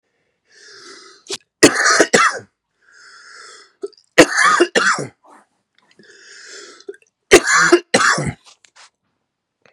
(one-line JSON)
{"three_cough_length": "9.7 s", "three_cough_amplitude": 32768, "three_cough_signal_mean_std_ratio": 0.37, "survey_phase": "beta (2021-08-13 to 2022-03-07)", "age": "18-44", "gender": "Male", "wearing_mask": "No", "symptom_cough_any": true, "symptom_runny_or_blocked_nose": true, "smoker_status": "Never smoked", "respiratory_condition_asthma": false, "respiratory_condition_other": false, "recruitment_source": "Test and Trace", "submission_delay": "2 days", "covid_test_result": "Positive", "covid_test_method": "RT-qPCR", "covid_ct_value": 18.6, "covid_ct_gene": "ORF1ab gene", "covid_ct_mean": 18.9, "covid_viral_load": "610000 copies/ml", "covid_viral_load_category": "Low viral load (10K-1M copies/ml)"}